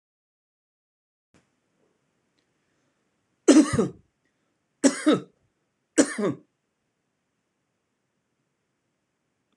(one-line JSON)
{"three_cough_length": "9.6 s", "three_cough_amplitude": 23891, "three_cough_signal_mean_std_ratio": 0.22, "survey_phase": "beta (2021-08-13 to 2022-03-07)", "age": "45-64", "gender": "Male", "wearing_mask": "No", "symptom_none": true, "symptom_onset": "8 days", "smoker_status": "Never smoked", "respiratory_condition_asthma": false, "respiratory_condition_other": false, "recruitment_source": "REACT", "submission_delay": "1 day", "covid_test_result": "Negative", "covid_test_method": "RT-qPCR"}